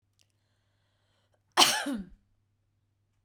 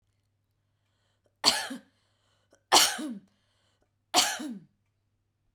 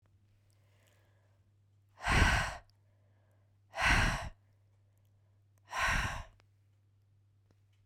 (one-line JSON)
{"cough_length": "3.2 s", "cough_amplitude": 17695, "cough_signal_mean_std_ratio": 0.25, "three_cough_length": "5.5 s", "three_cough_amplitude": 23283, "three_cough_signal_mean_std_ratio": 0.29, "exhalation_length": "7.9 s", "exhalation_amplitude": 7132, "exhalation_signal_mean_std_ratio": 0.35, "survey_phase": "beta (2021-08-13 to 2022-03-07)", "age": "18-44", "gender": "Female", "wearing_mask": "No", "symptom_none": true, "smoker_status": "Never smoked", "respiratory_condition_asthma": false, "respiratory_condition_other": false, "recruitment_source": "REACT", "submission_delay": "1 day", "covid_test_result": "Negative", "covid_test_method": "RT-qPCR"}